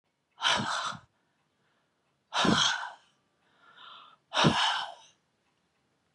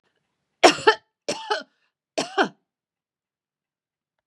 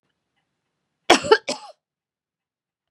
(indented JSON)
{
  "exhalation_length": "6.1 s",
  "exhalation_amplitude": 12008,
  "exhalation_signal_mean_std_ratio": 0.41,
  "three_cough_length": "4.3 s",
  "three_cough_amplitude": 32767,
  "three_cough_signal_mean_std_ratio": 0.24,
  "cough_length": "2.9 s",
  "cough_amplitude": 32767,
  "cough_signal_mean_std_ratio": 0.21,
  "survey_phase": "beta (2021-08-13 to 2022-03-07)",
  "age": "65+",
  "gender": "Female",
  "wearing_mask": "No",
  "symptom_none": true,
  "smoker_status": "Ex-smoker",
  "respiratory_condition_asthma": false,
  "respiratory_condition_other": false,
  "recruitment_source": "REACT",
  "submission_delay": "3 days",
  "covid_test_result": "Negative",
  "covid_test_method": "RT-qPCR",
  "influenza_a_test_result": "Negative",
  "influenza_b_test_result": "Negative"
}